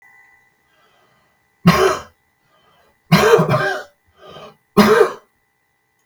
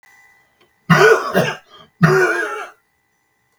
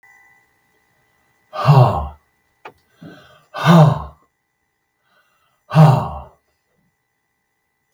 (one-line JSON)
{"three_cough_length": "6.1 s", "three_cough_amplitude": 32768, "three_cough_signal_mean_std_ratio": 0.38, "cough_length": "3.6 s", "cough_amplitude": 32768, "cough_signal_mean_std_ratio": 0.45, "exhalation_length": "7.9 s", "exhalation_amplitude": 32768, "exhalation_signal_mean_std_ratio": 0.31, "survey_phase": "beta (2021-08-13 to 2022-03-07)", "age": "65+", "gender": "Male", "wearing_mask": "No", "symptom_none": true, "smoker_status": "Ex-smoker", "respiratory_condition_asthma": false, "respiratory_condition_other": false, "recruitment_source": "REACT", "submission_delay": "1 day", "covid_test_result": "Negative", "covid_test_method": "RT-qPCR", "influenza_a_test_result": "Negative", "influenza_b_test_result": "Negative"}